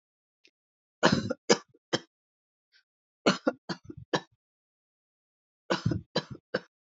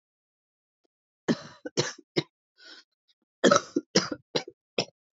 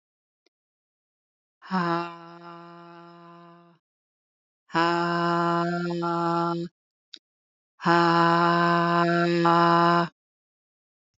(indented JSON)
{
  "three_cough_length": "6.9 s",
  "three_cough_amplitude": 18241,
  "three_cough_signal_mean_std_ratio": 0.27,
  "cough_length": "5.1 s",
  "cough_amplitude": 19197,
  "cough_signal_mean_std_ratio": 0.27,
  "exhalation_length": "11.2 s",
  "exhalation_amplitude": 18083,
  "exhalation_signal_mean_std_ratio": 0.5,
  "survey_phase": "alpha (2021-03-01 to 2021-08-12)",
  "age": "45-64",
  "gender": "Female",
  "wearing_mask": "No",
  "symptom_cough_any": true,
  "symptom_fatigue": true,
  "symptom_onset": "4 days",
  "smoker_status": "Current smoker (e-cigarettes or vapes only)",
  "respiratory_condition_asthma": false,
  "respiratory_condition_other": false,
  "recruitment_source": "Test and Trace",
  "submission_delay": "2 days",
  "covid_test_result": "Positive",
  "covid_test_method": "RT-qPCR"
}